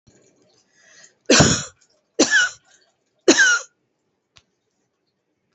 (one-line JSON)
{"three_cough_length": "5.5 s", "three_cough_amplitude": 29888, "three_cough_signal_mean_std_ratio": 0.33, "survey_phase": "beta (2021-08-13 to 2022-03-07)", "age": "45-64", "gender": "Female", "wearing_mask": "No", "symptom_shortness_of_breath": true, "symptom_fatigue": true, "symptom_headache": true, "symptom_onset": "11 days", "smoker_status": "Ex-smoker", "respiratory_condition_asthma": false, "respiratory_condition_other": true, "recruitment_source": "REACT", "submission_delay": "3 days", "covid_test_result": "Negative", "covid_test_method": "RT-qPCR", "influenza_a_test_result": "Negative", "influenza_b_test_result": "Negative"}